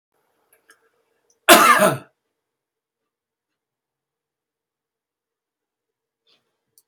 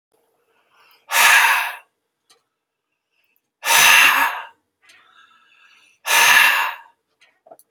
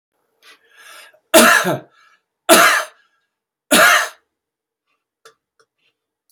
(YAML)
cough_length: 6.9 s
cough_amplitude: 32768
cough_signal_mean_std_ratio: 0.2
exhalation_length: 7.7 s
exhalation_amplitude: 32768
exhalation_signal_mean_std_ratio: 0.41
three_cough_length: 6.3 s
three_cough_amplitude: 32768
three_cough_signal_mean_std_ratio: 0.34
survey_phase: beta (2021-08-13 to 2022-03-07)
age: 65+
gender: Male
wearing_mask: 'No'
symptom_none: true
smoker_status: Ex-smoker
respiratory_condition_asthma: false
respiratory_condition_other: false
recruitment_source: REACT
submission_delay: 1 day
covid_test_result: Negative
covid_test_method: RT-qPCR
influenza_a_test_result: Negative
influenza_b_test_result: Negative